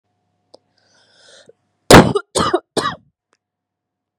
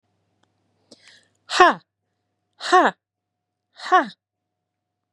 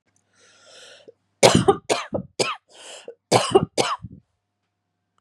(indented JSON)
{
  "cough_length": "4.2 s",
  "cough_amplitude": 32768,
  "cough_signal_mean_std_ratio": 0.25,
  "exhalation_length": "5.1 s",
  "exhalation_amplitude": 32767,
  "exhalation_signal_mean_std_ratio": 0.25,
  "three_cough_length": "5.2 s",
  "three_cough_amplitude": 32768,
  "three_cough_signal_mean_std_ratio": 0.33,
  "survey_phase": "beta (2021-08-13 to 2022-03-07)",
  "age": "18-44",
  "gender": "Female",
  "wearing_mask": "No",
  "symptom_runny_or_blocked_nose": true,
  "symptom_fatigue": true,
  "symptom_onset": "12 days",
  "smoker_status": "Current smoker (e-cigarettes or vapes only)",
  "respiratory_condition_asthma": false,
  "respiratory_condition_other": false,
  "recruitment_source": "REACT",
  "submission_delay": "3 days",
  "covid_test_result": "Negative",
  "covid_test_method": "RT-qPCR",
  "influenza_a_test_result": "Unknown/Void",
  "influenza_b_test_result": "Unknown/Void"
}